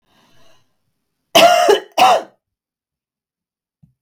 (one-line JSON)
{"cough_length": "4.0 s", "cough_amplitude": 32768, "cough_signal_mean_std_ratio": 0.34, "survey_phase": "beta (2021-08-13 to 2022-03-07)", "age": "45-64", "gender": "Female", "wearing_mask": "No", "symptom_none": true, "smoker_status": "Never smoked", "respiratory_condition_asthma": false, "respiratory_condition_other": false, "recruitment_source": "REACT", "submission_delay": "3 days", "covid_test_result": "Negative", "covid_test_method": "RT-qPCR", "influenza_a_test_result": "Negative", "influenza_b_test_result": "Negative"}